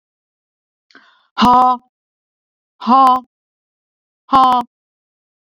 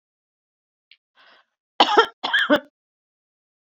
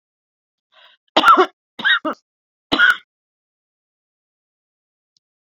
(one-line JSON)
{"exhalation_length": "5.5 s", "exhalation_amplitude": 30298, "exhalation_signal_mean_std_ratio": 0.35, "cough_length": "3.7 s", "cough_amplitude": 30904, "cough_signal_mean_std_ratio": 0.28, "three_cough_length": "5.5 s", "three_cough_amplitude": 31324, "three_cough_signal_mean_std_ratio": 0.28, "survey_phase": "beta (2021-08-13 to 2022-03-07)", "age": "45-64", "gender": "Female", "wearing_mask": "No", "symptom_none": true, "smoker_status": "Ex-smoker", "respiratory_condition_asthma": false, "respiratory_condition_other": false, "recruitment_source": "REACT", "submission_delay": "1 day", "covid_test_result": "Negative", "covid_test_method": "RT-qPCR"}